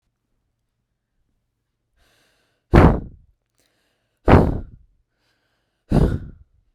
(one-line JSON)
{"exhalation_length": "6.7 s", "exhalation_amplitude": 32768, "exhalation_signal_mean_std_ratio": 0.26, "survey_phase": "beta (2021-08-13 to 2022-03-07)", "age": "18-44", "gender": "Female", "wearing_mask": "No", "symptom_runny_or_blocked_nose": true, "symptom_sore_throat": true, "smoker_status": "Never smoked", "respiratory_condition_asthma": false, "respiratory_condition_other": false, "recruitment_source": "REACT", "submission_delay": "1 day", "covid_test_result": "Negative", "covid_test_method": "RT-qPCR"}